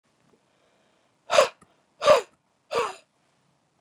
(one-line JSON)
{"exhalation_length": "3.8 s", "exhalation_amplitude": 19992, "exhalation_signal_mean_std_ratio": 0.26, "survey_phase": "beta (2021-08-13 to 2022-03-07)", "age": "45-64", "gender": "Female", "wearing_mask": "No", "symptom_none": true, "smoker_status": "Ex-smoker", "respiratory_condition_asthma": false, "respiratory_condition_other": false, "recruitment_source": "REACT", "submission_delay": "3 days", "covid_test_result": "Negative", "covid_test_method": "RT-qPCR", "influenza_a_test_result": "Negative", "influenza_b_test_result": "Negative"}